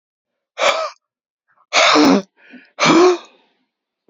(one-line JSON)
{"exhalation_length": "4.1 s", "exhalation_amplitude": 31181, "exhalation_signal_mean_std_ratio": 0.44, "survey_phase": "alpha (2021-03-01 to 2021-08-12)", "age": "45-64", "gender": "Male", "wearing_mask": "No", "symptom_none": true, "smoker_status": "Never smoked", "respiratory_condition_asthma": false, "respiratory_condition_other": false, "recruitment_source": "REACT", "submission_delay": "31 days", "covid_test_result": "Negative", "covid_test_method": "RT-qPCR"}